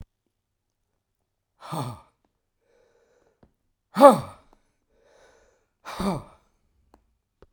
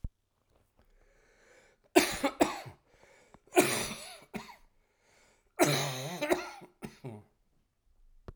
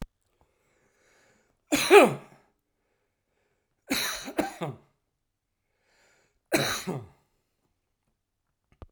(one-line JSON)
{"exhalation_length": "7.5 s", "exhalation_amplitude": 32767, "exhalation_signal_mean_std_ratio": 0.17, "cough_length": "8.4 s", "cough_amplitude": 15079, "cough_signal_mean_std_ratio": 0.33, "three_cough_length": "8.9 s", "three_cough_amplitude": 27810, "three_cough_signal_mean_std_ratio": 0.24, "survey_phase": "alpha (2021-03-01 to 2021-08-12)", "age": "65+", "gender": "Male", "wearing_mask": "No", "symptom_none": true, "symptom_onset": "11 days", "smoker_status": "Ex-smoker", "respiratory_condition_asthma": false, "respiratory_condition_other": false, "recruitment_source": "REACT", "submission_delay": "11 days", "covid_test_result": "Negative", "covid_test_method": "RT-qPCR"}